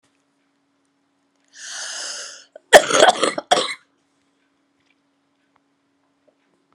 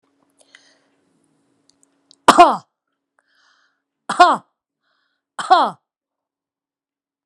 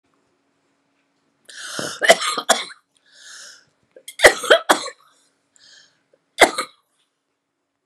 {"cough_length": "6.7 s", "cough_amplitude": 32768, "cough_signal_mean_std_ratio": 0.24, "exhalation_length": "7.3 s", "exhalation_amplitude": 32768, "exhalation_signal_mean_std_ratio": 0.22, "three_cough_length": "7.9 s", "three_cough_amplitude": 32768, "three_cough_signal_mean_std_ratio": 0.26, "survey_phase": "beta (2021-08-13 to 2022-03-07)", "age": "45-64", "gender": "Female", "wearing_mask": "No", "symptom_cough_any": true, "symptom_shortness_of_breath": true, "symptom_fatigue": true, "smoker_status": "Current smoker (11 or more cigarettes per day)", "respiratory_condition_asthma": false, "respiratory_condition_other": true, "recruitment_source": "REACT", "submission_delay": "12 days", "covid_test_result": "Negative", "covid_test_method": "RT-qPCR"}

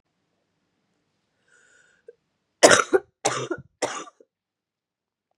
{"three_cough_length": "5.4 s", "three_cough_amplitude": 32768, "three_cough_signal_mean_std_ratio": 0.22, "survey_phase": "beta (2021-08-13 to 2022-03-07)", "age": "18-44", "gender": "Female", "wearing_mask": "No", "symptom_cough_any": true, "symptom_new_continuous_cough": true, "symptom_runny_or_blocked_nose": true, "symptom_abdominal_pain": true, "symptom_fatigue": true, "symptom_fever_high_temperature": true, "symptom_headache": true, "symptom_change_to_sense_of_smell_or_taste": true, "symptom_loss_of_taste": true, "symptom_onset": "4 days", "smoker_status": "Current smoker (e-cigarettes or vapes only)", "respiratory_condition_asthma": false, "respiratory_condition_other": false, "recruitment_source": "Test and Trace", "submission_delay": "1 day", "covid_test_result": "Positive", "covid_test_method": "RT-qPCR", "covid_ct_value": 16.7, "covid_ct_gene": "S gene", "covid_ct_mean": 17.1, "covid_viral_load": "2400000 copies/ml", "covid_viral_load_category": "High viral load (>1M copies/ml)"}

